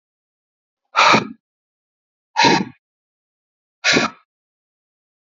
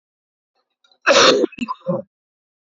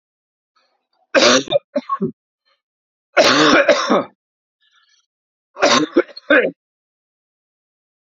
{
  "exhalation_length": "5.4 s",
  "exhalation_amplitude": 30603,
  "exhalation_signal_mean_std_ratio": 0.3,
  "cough_length": "2.7 s",
  "cough_amplitude": 30120,
  "cough_signal_mean_std_ratio": 0.37,
  "three_cough_length": "8.0 s",
  "three_cough_amplitude": 32767,
  "three_cough_signal_mean_std_ratio": 0.39,
  "survey_phase": "beta (2021-08-13 to 2022-03-07)",
  "age": "45-64",
  "gender": "Male",
  "wearing_mask": "No",
  "symptom_cough_any": true,
  "symptom_runny_or_blocked_nose": true,
  "symptom_sore_throat": true,
  "symptom_fatigue": true,
  "symptom_fever_high_temperature": true,
  "symptom_headache": true,
  "symptom_change_to_sense_of_smell_or_taste": true,
  "symptom_loss_of_taste": true,
  "symptom_onset": "4 days",
  "smoker_status": "Never smoked",
  "respiratory_condition_asthma": false,
  "respiratory_condition_other": false,
  "recruitment_source": "Test and Trace",
  "submission_delay": "2 days",
  "covid_test_result": "Positive",
  "covid_test_method": "RT-qPCR",
  "covid_ct_value": 21.1,
  "covid_ct_gene": "ORF1ab gene"
}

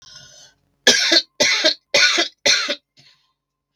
{
  "three_cough_length": "3.8 s",
  "three_cough_amplitude": 32768,
  "three_cough_signal_mean_std_ratio": 0.48,
  "survey_phase": "beta (2021-08-13 to 2022-03-07)",
  "age": "65+",
  "gender": "Female",
  "wearing_mask": "No",
  "symptom_cough_any": true,
  "symptom_runny_or_blocked_nose": true,
  "symptom_other": true,
  "smoker_status": "Never smoked",
  "respiratory_condition_asthma": true,
  "respiratory_condition_other": false,
  "recruitment_source": "Test and Trace",
  "submission_delay": "1 day",
  "covid_test_result": "Negative",
  "covid_test_method": "RT-qPCR"
}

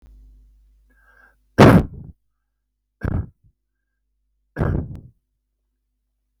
{
  "three_cough_length": "6.4 s",
  "three_cough_amplitude": 32768,
  "three_cough_signal_mean_std_ratio": 0.23,
  "survey_phase": "beta (2021-08-13 to 2022-03-07)",
  "age": "65+",
  "gender": "Male",
  "wearing_mask": "No",
  "symptom_none": true,
  "smoker_status": "Never smoked",
  "respiratory_condition_asthma": false,
  "respiratory_condition_other": false,
  "recruitment_source": "REACT",
  "submission_delay": "1 day",
  "covid_test_result": "Negative",
  "covid_test_method": "RT-qPCR",
  "influenza_a_test_result": "Negative",
  "influenza_b_test_result": "Negative"
}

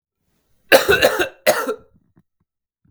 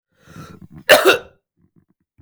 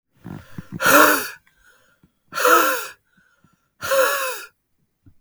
{
  "three_cough_length": "2.9 s",
  "three_cough_amplitude": 32768,
  "three_cough_signal_mean_std_ratio": 0.37,
  "cough_length": "2.2 s",
  "cough_amplitude": 32768,
  "cough_signal_mean_std_ratio": 0.29,
  "exhalation_length": "5.2 s",
  "exhalation_amplitude": 32766,
  "exhalation_signal_mean_std_ratio": 0.43,
  "survey_phase": "beta (2021-08-13 to 2022-03-07)",
  "age": "18-44",
  "gender": "Male",
  "wearing_mask": "No",
  "symptom_cough_any": true,
  "symptom_runny_or_blocked_nose": true,
  "symptom_shortness_of_breath": true,
  "symptom_sore_throat": true,
  "symptom_onset": "7 days",
  "smoker_status": "Never smoked",
  "respiratory_condition_asthma": false,
  "respiratory_condition_other": false,
  "recruitment_source": "Test and Trace",
  "submission_delay": "2 days",
  "covid_test_result": "Negative",
  "covid_test_method": "RT-qPCR"
}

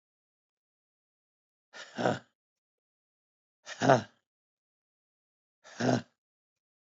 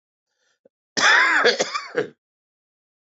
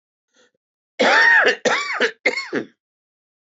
{
  "exhalation_length": "7.0 s",
  "exhalation_amplitude": 13862,
  "exhalation_signal_mean_std_ratio": 0.22,
  "cough_length": "3.2 s",
  "cough_amplitude": 20354,
  "cough_signal_mean_std_ratio": 0.42,
  "three_cough_length": "3.4 s",
  "three_cough_amplitude": 20215,
  "three_cough_signal_mean_std_ratio": 0.5,
  "survey_phase": "beta (2021-08-13 to 2022-03-07)",
  "age": "45-64",
  "gender": "Male",
  "wearing_mask": "No",
  "symptom_none": true,
  "symptom_onset": "4 days",
  "smoker_status": "Never smoked",
  "respiratory_condition_asthma": true,
  "respiratory_condition_other": false,
  "recruitment_source": "Test and Trace",
  "submission_delay": "1 day",
  "covid_test_result": "Negative",
  "covid_test_method": "RT-qPCR"
}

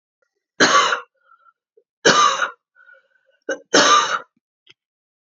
{
  "three_cough_length": "5.3 s",
  "three_cough_amplitude": 31155,
  "three_cough_signal_mean_std_ratio": 0.4,
  "survey_phase": "beta (2021-08-13 to 2022-03-07)",
  "age": "18-44",
  "gender": "Female",
  "wearing_mask": "No",
  "symptom_cough_any": true,
  "symptom_runny_or_blocked_nose": true,
  "symptom_shortness_of_breath": true,
  "symptom_sore_throat": true,
  "symptom_fatigue": true,
  "symptom_onset": "5 days",
  "smoker_status": "Never smoked",
  "respiratory_condition_asthma": false,
  "respiratory_condition_other": false,
  "recruitment_source": "Test and Trace",
  "submission_delay": "2 days",
  "covid_test_result": "Positive",
  "covid_test_method": "RT-qPCR",
  "covid_ct_value": 22.0,
  "covid_ct_gene": "N gene"
}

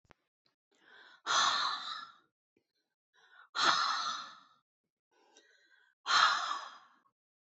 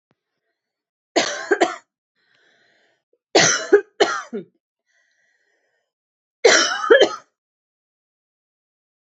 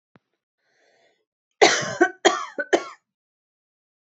{
  "exhalation_length": "7.5 s",
  "exhalation_amplitude": 9408,
  "exhalation_signal_mean_std_ratio": 0.4,
  "three_cough_length": "9.0 s",
  "three_cough_amplitude": 30555,
  "three_cough_signal_mean_std_ratio": 0.31,
  "cough_length": "4.2 s",
  "cough_amplitude": 28284,
  "cough_signal_mean_std_ratio": 0.28,
  "survey_phase": "beta (2021-08-13 to 2022-03-07)",
  "age": "18-44",
  "gender": "Female",
  "wearing_mask": "No",
  "symptom_none": true,
  "smoker_status": "Never smoked",
  "respiratory_condition_asthma": false,
  "respiratory_condition_other": false,
  "recruitment_source": "REACT",
  "submission_delay": "3 days",
  "covid_test_result": "Negative",
  "covid_test_method": "RT-qPCR",
  "influenza_a_test_result": "Negative",
  "influenza_b_test_result": "Negative"
}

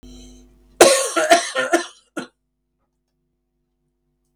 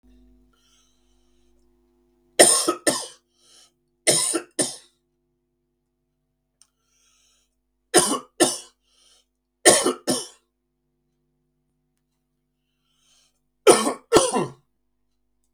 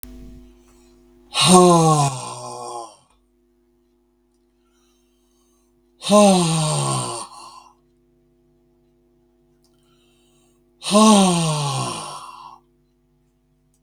{
  "cough_length": "4.4 s",
  "cough_amplitude": 32768,
  "cough_signal_mean_std_ratio": 0.33,
  "three_cough_length": "15.5 s",
  "three_cough_amplitude": 32768,
  "three_cough_signal_mean_std_ratio": 0.27,
  "exhalation_length": "13.8 s",
  "exhalation_amplitude": 32768,
  "exhalation_signal_mean_std_ratio": 0.39,
  "survey_phase": "beta (2021-08-13 to 2022-03-07)",
  "age": "65+",
  "gender": "Male",
  "wearing_mask": "No",
  "symptom_runny_or_blocked_nose": true,
  "smoker_status": "Ex-smoker",
  "respiratory_condition_asthma": false,
  "respiratory_condition_other": false,
  "recruitment_source": "REACT",
  "submission_delay": "1 day",
  "covid_test_result": "Negative",
  "covid_test_method": "RT-qPCR",
  "influenza_a_test_result": "Unknown/Void",
  "influenza_b_test_result": "Unknown/Void"
}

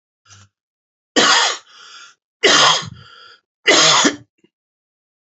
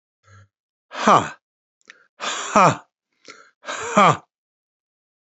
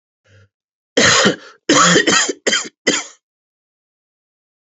{
  "three_cough_length": "5.2 s",
  "three_cough_amplitude": 32624,
  "three_cough_signal_mean_std_ratio": 0.42,
  "exhalation_length": "5.2 s",
  "exhalation_amplitude": 32767,
  "exhalation_signal_mean_std_ratio": 0.31,
  "cough_length": "4.7 s",
  "cough_amplitude": 32767,
  "cough_signal_mean_std_ratio": 0.44,
  "survey_phase": "beta (2021-08-13 to 2022-03-07)",
  "age": "65+",
  "gender": "Male",
  "wearing_mask": "No",
  "symptom_none": true,
  "smoker_status": "Never smoked",
  "respiratory_condition_asthma": false,
  "respiratory_condition_other": false,
  "recruitment_source": "REACT",
  "submission_delay": "2 days",
  "covid_test_result": "Negative",
  "covid_test_method": "RT-qPCR",
  "influenza_a_test_result": "Negative",
  "influenza_b_test_result": "Negative"
}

